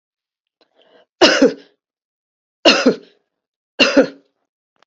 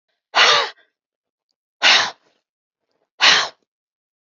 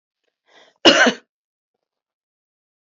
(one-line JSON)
{"three_cough_length": "4.9 s", "three_cough_amplitude": 32768, "three_cough_signal_mean_std_ratio": 0.32, "exhalation_length": "4.4 s", "exhalation_amplitude": 30912, "exhalation_signal_mean_std_ratio": 0.35, "cough_length": "2.8 s", "cough_amplitude": 30743, "cough_signal_mean_std_ratio": 0.24, "survey_phase": "alpha (2021-03-01 to 2021-08-12)", "age": "65+", "gender": "Female", "wearing_mask": "No", "symptom_none": true, "smoker_status": "Never smoked", "respiratory_condition_asthma": false, "respiratory_condition_other": false, "recruitment_source": "REACT", "submission_delay": "2 days", "covid_test_result": "Negative", "covid_test_method": "RT-qPCR"}